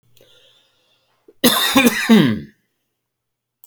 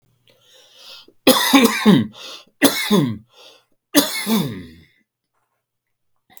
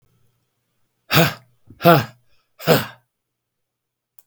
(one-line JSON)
{"cough_length": "3.7 s", "cough_amplitude": 32768, "cough_signal_mean_std_ratio": 0.39, "three_cough_length": "6.4 s", "three_cough_amplitude": 32768, "three_cough_signal_mean_std_ratio": 0.41, "exhalation_length": "4.3 s", "exhalation_amplitude": 32768, "exhalation_signal_mean_std_ratio": 0.29, "survey_phase": "beta (2021-08-13 to 2022-03-07)", "age": "65+", "gender": "Male", "wearing_mask": "No", "symptom_none": true, "smoker_status": "Never smoked", "respiratory_condition_asthma": false, "respiratory_condition_other": false, "recruitment_source": "REACT", "submission_delay": "3 days", "covid_test_result": "Negative", "covid_test_method": "RT-qPCR", "influenza_a_test_result": "Negative", "influenza_b_test_result": "Negative"}